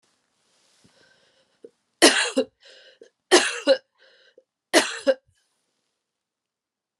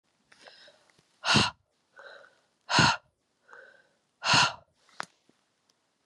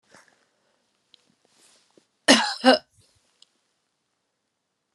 {"three_cough_length": "7.0 s", "three_cough_amplitude": 32732, "three_cough_signal_mean_std_ratio": 0.27, "exhalation_length": "6.1 s", "exhalation_amplitude": 12754, "exhalation_signal_mean_std_ratio": 0.3, "cough_length": "4.9 s", "cough_amplitude": 31784, "cough_signal_mean_std_ratio": 0.2, "survey_phase": "beta (2021-08-13 to 2022-03-07)", "age": "45-64", "gender": "Female", "wearing_mask": "No", "symptom_cough_any": true, "symptom_runny_or_blocked_nose": true, "symptom_fatigue": true, "symptom_headache": true, "symptom_change_to_sense_of_smell_or_taste": true, "symptom_other": true, "symptom_onset": "3 days", "smoker_status": "Ex-smoker", "respiratory_condition_asthma": false, "respiratory_condition_other": false, "recruitment_source": "Test and Trace", "submission_delay": "2 days", "covid_test_result": "Positive", "covid_test_method": "RT-qPCR", "covid_ct_value": 13.8, "covid_ct_gene": "ORF1ab gene", "covid_ct_mean": 14.2, "covid_viral_load": "23000000 copies/ml", "covid_viral_load_category": "High viral load (>1M copies/ml)"}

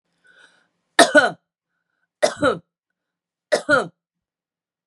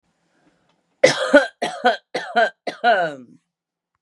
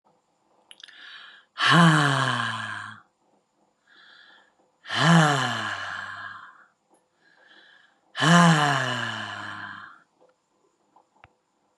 {"three_cough_length": "4.9 s", "three_cough_amplitude": 32767, "three_cough_signal_mean_std_ratio": 0.28, "cough_length": "4.0 s", "cough_amplitude": 32768, "cough_signal_mean_std_ratio": 0.4, "exhalation_length": "11.8 s", "exhalation_amplitude": 23839, "exhalation_signal_mean_std_ratio": 0.41, "survey_phase": "beta (2021-08-13 to 2022-03-07)", "age": "45-64", "gender": "Female", "wearing_mask": "No", "symptom_runny_or_blocked_nose": true, "symptom_sore_throat": true, "symptom_fatigue": true, "symptom_headache": true, "symptom_onset": "5 days", "smoker_status": "Ex-smoker", "respiratory_condition_asthma": false, "respiratory_condition_other": false, "recruitment_source": "Test and Trace", "submission_delay": "1 day", "covid_test_result": "Positive", "covid_test_method": "RT-qPCR", "covid_ct_value": 25.0, "covid_ct_gene": "N gene"}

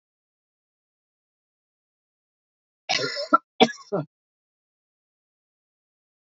{"cough_length": "6.2 s", "cough_amplitude": 25525, "cough_signal_mean_std_ratio": 0.19, "survey_phase": "beta (2021-08-13 to 2022-03-07)", "age": "45-64", "gender": "Male", "wearing_mask": "No", "symptom_runny_or_blocked_nose": true, "symptom_fatigue": true, "symptom_change_to_sense_of_smell_or_taste": true, "symptom_loss_of_taste": true, "smoker_status": "Never smoked", "respiratory_condition_asthma": false, "respiratory_condition_other": false, "recruitment_source": "Test and Trace", "submission_delay": "2 days", "covid_test_result": "Positive", "covid_test_method": "RT-qPCR", "covid_ct_value": 19.5, "covid_ct_gene": "ORF1ab gene", "covid_ct_mean": 19.6, "covid_viral_load": "380000 copies/ml", "covid_viral_load_category": "Low viral load (10K-1M copies/ml)"}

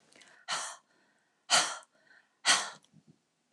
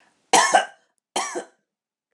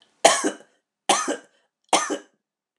{"exhalation_length": "3.5 s", "exhalation_amplitude": 9616, "exhalation_signal_mean_std_ratio": 0.32, "cough_length": "2.1 s", "cough_amplitude": 29163, "cough_signal_mean_std_ratio": 0.35, "three_cough_length": "2.8 s", "three_cough_amplitude": 29204, "three_cough_signal_mean_std_ratio": 0.36, "survey_phase": "alpha (2021-03-01 to 2021-08-12)", "age": "45-64", "gender": "Female", "wearing_mask": "No", "symptom_none": true, "smoker_status": "Never smoked", "respiratory_condition_asthma": false, "respiratory_condition_other": false, "recruitment_source": "REACT", "submission_delay": "2 days", "covid_test_result": "Negative", "covid_test_method": "RT-qPCR"}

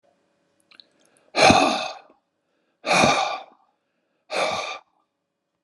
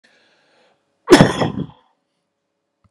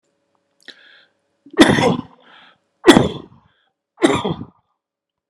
{"exhalation_length": "5.6 s", "exhalation_amplitude": 31212, "exhalation_signal_mean_std_ratio": 0.37, "cough_length": "2.9 s", "cough_amplitude": 32768, "cough_signal_mean_std_ratio": 0.26, "three_cough_length": "5.3 s", "three_cough_amplitude": 32768, "three_cough_signal_mean_std_ratio": 0.31, "survey_phase": "alpha (2021-03-01 to 2021-08-12)", "age": "65+", "gender": "Male", "wearing_mask": "No", "symptom_none": true, "smoker_status": "Ex-smoker", "respiratory_condition_asthma": false, "respiratory_condition_other": false, "recruitment_source": "REACT", "submission_delay": "2 days", "covid_test_result": "Negative", "covid_test_method": "RT-qPCR"}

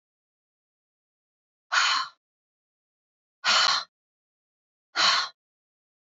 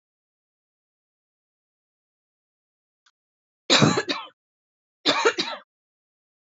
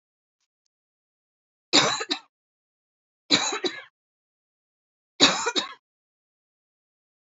{"exhalation_length": "6.1 s", "exhalation_amplitude": 12612, "exhalation_signal_mean_std_ratio": 0.33, "cough_length": "6.5 s", "cough_amplitude": 23582, "cough_signal_mean_std_ratio": 0.26, "three_cough_length": "7.3 s", "three_cough_amplitude": 24799, "three_cough_signal_mean_std_ratio": 0.28, "survey_phase": "beta (2021-08-13 to 2022-03-07)", "age": "45-64", "gender": "Female", "wearing_mask": "No", "symptom_cough_any": true, "symptom_sore_throat": true, "symptom_diarrhoea": true, "symptom_fatigue": true, "smoker_status": "Never smoked", "respiratory_condition_asthma": false, "respiratory_condition_other": false, "recruitment_source": "Test and Trace", "submission_delay": "2 days", "covid_test_result": "Positive", "covid_test_method": "RT-qPCR", "covid_ct_value": 30.9, "covid_ct_gene": "N gene", "covid_ct_mean": 31.4, "covid_viral_load": "49 copies/ml", "covid_viral_load_category": "Minimal viral load (< 10K copies/ml)"}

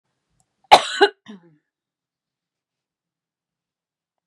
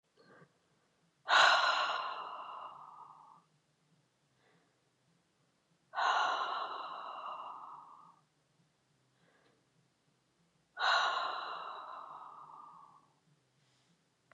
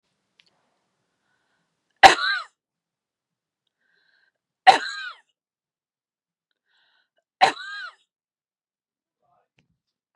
{"cough_length": "4.3 s", "cough_amplitude": 32768, "cough_signal_mean_std_ratio": 0.16, "exhalation_length": "14.3 s", "exhalation_amplitude": 7787, "exhalation_signal_mean_std_ratio": 0.38, "three_cough_length": "10.2 s", "three_cough_amplitude": 32768, "three_cough_signal_mean_std_ratio": 0.16, "survey_phase": "beta (2021-08-13 to 2022-03-07)", "age": "45-64", "gender": "Female", "wearing_mask": "No", "symptom_none": true, "smoker_status": "Never smoked", "respiratory_condition_asthma": false, "respiratory_condition_other": false, "recruitment_source": "REACT", "submission_delay": "1 day", "covid_test_result": "Negative", "covid_test_method": "RT-qPCR", "influenza_a_test_result": "Unknown/Void", "influenza_b_test_result": "Unknown/Void"}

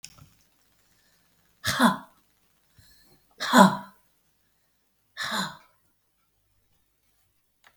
{"exhalation_length": "7.8 s", "exhalation_amplitude": 25345, "exhalation_signal_mean_std_ratio": 0.23, "survey_phase": "beta (2021-08-13 to 2022-03-07)", "age": "65+", "gender": "Female", "wearing_mask": "No", "symptom_none": true, "smoker_status": "Current smoker (e-cigarettes or vapes only)", "respiratory_condition_asthma": false, "respiratory_condition_other": true, "recruitment_source": "REACT", "submission_delay": "1 day", "covid_test_result": "Negative", "covid_test_method": "RT-qPCR"}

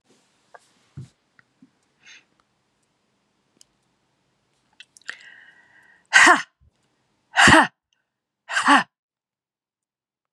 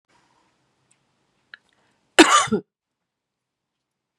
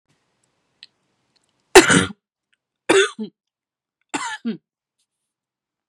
{"exhalation_length": "10.3 s", "exhalation_amplitude": 32240, "exhalation_signal_mean_std_ratio": 0.23, "cough_length": "4.2 s", "cough_amplitude": 32768, "cough_signal_mean_std_ratio": 0.2, "three_cough_length": "5.9 s", "three_cough_amplitude": 32768, "three_cough_signal_mean_std_ratio": 0.24, "survey_phase": "beta (2021-08-13 to 2022-03-07)", "age": "45-64", "gender": "Female", "wearing_mask": "No", "symptom_cough_any": true, "symptom_runny_or_blocked_nose": true, "symptom_fatigue": true, "symptom_headache": true, "symptom_other": true, "symptom_onset": "3 days", "smoker_status": "Never smoked", "respiratory_condition_asthma": false, "respiratory_condition_other": false, "recruitment_source": "Test and Trace", "submission_delay": "1 day", "covid_test_result": "Positive", "covid_test_method": "ePCR"}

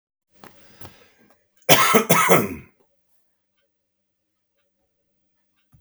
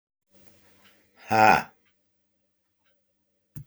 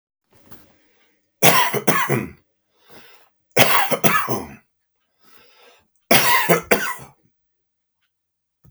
{"cough_length": "5.8 s", "cough_amplitude": 32768, "cough_signal_mean_std_ratio": 0.28, "exhalation_length": "3.7 s", "exhalation_amplitude": 22204, "exhalation_signal_mean_std_ratio": 0.23, "three_cough_length": "8.7 s", "three_cough_amplitude": 32768, "three_cough_signal_mean_std_ratio": 0.39, "survey_phase": "beta (2021-08-13 to 2022-03-07)", "age": "65+", "gender": "Male", "wearing_mask": "No", "symptom_none": true, "smoker_status": "Ex-smoker", "respiratory_condition_asthma": false, "respiratory_condition_other": false, "recruitment_source": "REACT", "submission_delay": "3 days", "covid_test_result": "Negative", "covid_test_method": "RT-qPCR"}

